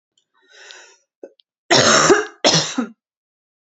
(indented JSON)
{
  "cough_length": "3.8 s",
  "cough_amplitude": 32623,
  "cough_signal_mean_std_ratio": 0.4,
  "survey_phase": "alpha (2021-03-01 to 2021-08-12)",
  "age": "18-44",
  "gender": "Female",
  "wearing_mask": "No",
  "symptom_cough_any": true,
  "symptom_new_continuous_cough": true,
  "symptom_fatigue": true,
  "symptom_onset": "4 days",
  "smoker_status": "Never smoked",
  "respiratory_condition_asthma": false,
  "respiratory_condition_other": false,
  "recruitment_source": "Test and Trace",
  "submission_delay": "1 day",
  "covid_test_result": "Positive",
  "covid_test_method": "RT-qPCR",
  "covid_ct_value": 29.8,
  "covid_ct_gene": "ORF1ab gene"
}